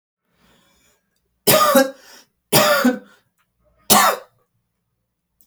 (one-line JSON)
{"three_cough_length": "5.5 s", "three_cough_amplitude": 32768, "three_cough_signal_mean_std_ratio": 0.37, "survey_phase": "alpha (2021-03-01 to 2021-08-12)", "age": "18-44", "gender": "Male", "wearing_mask": "No", "symptom_none": true, "smoker_status": "Never smoked", "respiratory_condition_asthma": false, "respiratory_condition_other": false, "recruitment_source": "REACT", "submission_delay": "1 day", "covid_test_result": "Negative", "covid_test_method": "RT-qPCR"}